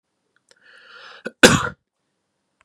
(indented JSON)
{
  "cough_length": "2.6 s",
  "cough_amplitude": 32768,
  "cough_signal_mean_std_ratio": 0.21,
  "survey_phase": "beta (2021-08-13 to 2022-03-07)",
  "age": "18-44",
  "gender": "Male",
  "wearing_mask": "No",
  "symptom_none": true,
  "smoker_status": "Never smoked",
  "respiratory_condition_asthma": false,
  "respiratory_condition_other": false,
  "recruitment_source": "REACT",
  "submission_delay": "1 day",
  "covid_test_result": "Negative",
  "covid_test_method": "RT-qPCR"
}